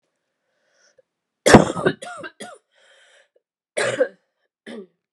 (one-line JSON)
{"cough_length": "5.1 s", "cough_amplitude": 32768, "cough_signal_mean_std_ratio": 0.25, "survey_phase": "beta (2021-08-13 to 2022-03-07)", "age": "45-64", "gender": "Female", "wearing_mask": "No", "symptom_runny_or_blocked_nose": true, "symptom_sore_throat": true, "symptom_headache": true, "symptom_onset": "7 days", "smoker_status": "Never smoked", "respiratory_condition_asthma": false, "respiratory_condition_other": false, "recruitment_source": "Test and Trace", "submission_delay": "2 days", "covid_test_result": "Positive", "covid_test_method": "RT-qPCR", "covid_ct_value": 15.2, "covid_ct_gene": "N gene", "covid_ct_mean": 16.1, "covid_viral_load": "5100000 copies/ml", "covid_viral_load_category": "High viral load (>1M copies/ml)"}